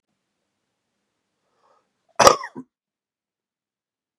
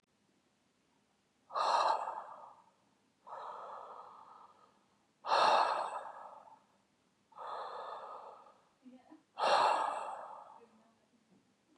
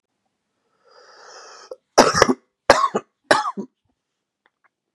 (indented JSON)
{
  "cough_length": "4.2 s",
  "cough_amplitude": 32768,
  "cough_signal_mean_std_ratio": 0.15,
  "exhalation_length": "11.8 s",
  "exhalation_amplitude": 4927,
  "exhalation_signal_mean_std_ratio": 0.41,
  "three_cough_length": "4.9 s",
  "three_cough_amplitude": 32768,
  "three_cough_signal_mean_std_ratio": 0.28,
  "survey_phase": "beta (2021-08-13 to 2022-03-07)",
  "age": "18-44",
  "gender": "Male",
  "wearing_mask": "No",
  "symptom_cough_any": true,
  "symptom_runny_or_blocked_nose": true,
  "symptom_shortness_of_breath": true,
  "symptom_sore_throat": true,
  "symptom_fatigue": true,
  "symptom_fever_high_temperature": true,
  "symptom_headache": true,
  "smoker_status": "Never smoked",
  "respiratory_condition_asthma": false,
  "respiratory_condition_other": false,
  "recruitment_source": "Test and Trace",
  "submission_delay": "1 day",
  "covid_test_result": "Positive",
  "covid_test_method": "ePCR"
}